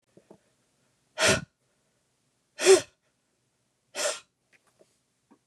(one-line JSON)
{"exhalation_length": "5.5 s", "exhalation_amplitude": 16109, "exhalation_signal_mean_std_ratio": 0.23, "survey_phase": "beta (2021-08-13 to 2022-03-07)", "age": "45-64", "gender": "Female", "wearing_mask": "No", "symptom_cough_any": true, "symptom_runny_or_blocked_nose": true, "symptom_sore_throat": true, "symptom_onset": "9 days", "smoker_status": "Ex-smoker", "respiratory_condition_asthma": false, "respiratory_condition_other": false, "recruitment_source": "REACT", "submission_delay": "0 days", "covid_test_result": "Positive", "covid_test_method": "RT-qPCR", "covid_ct_value": 25.0, "covid_ct_gene": "E gene", "influenza_a_test_result": "Negative", "influenza_b_test_result": "Negative"}